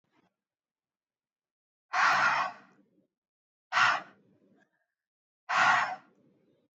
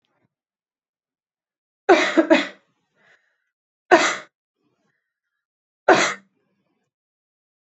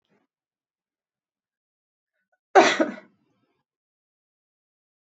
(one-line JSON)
{"exhalation_length": "6.7 s", "exhalation_amplitude": 8333, "exhalation_signal_mean_std_ratio": 0.36, "three_cough_length": "7.8 s", "three_cough_amplitude": 29344, "three_cough_signal_mean_std_ratio": 0.25, "cough_length": "5.0 s", "cough_amplitude": 27905, "cough_signal_mean_std_ratio": 0.17, "survey_phase": "alpha (2021-03-01 to 2021-08-12)", "age": "18-44", "gender": "Female", "wearing_mask": "No", "symptom_none": true, "smoker_status": "Never smoked", "respiratory_condition_asthma": true, "respiratory_condition_other": false, "recruitment_source": "REACT", "submission_delay": "1 day", "covid_test_result": "Negative", "covid_test_method": "RT-qPCR"}